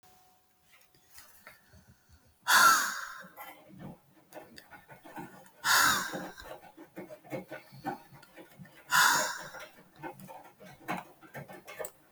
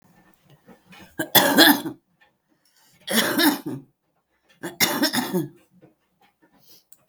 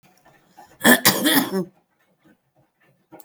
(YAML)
exhalation_length: 12.1 s
exhalation_amplitude: 10300
exhalation_signal_mean_std_ratio: 0.36
three_cough_length: 7.1 s
three_cough_amplitude: 32768
three_cough_signal_mean_std_ratio: 0.37
cough_length: 3.2 s
cough_amplitude: 32768
cough_signal_mean_std_ratio: 0.35
survey_phase: beta (2021-08-13 to 2022-03-07)
age: 65+
gender: Female
wearing_mask: 'No'
symptom_cough_any: true
smoker_status: Current smoker (11 or more cigarettes per day)
respiratory_condition_asthma: false
respiratory_condition_other: false
recruitment_source: REACT
submission_delay: 3 days
covid_test_result: Negative
covid_test_method: RT-qPCR
influenza_a_test_result: Negative
influenza_b_test_result: Negative